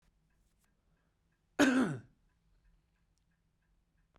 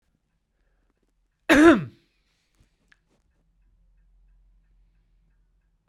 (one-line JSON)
{"cough_length": "4.2 s", "cough_amplitude": 7207, "cough_signal_mean_std_ratio": 0.25, "three_cough_length": "5.9 s", "three_cough_amplitude": 27408, "three_cough_signal_mean_std_ratio": 0.19, "survey_phase": "beta (2021-08-13 to 2022-03-07)", "age": "45-64", "gender": "Male", "wearing_mask": "No", "symptom_cough_any": true, "symptom_runny_or_blocked_nose": true, "symptom_abdominal_pain": true, "symptom_fatigue": true, "symptom_headache": true, "smoker_status": "Ex-smoker", "respiratory_condition_asthma": false, "respiratory_condition_other": false, "recruitment_source": "Test and Trace", "submission_delay": "2 days", "covid_test_result": "Positive", "covid_test_method": "RT-qPCR"}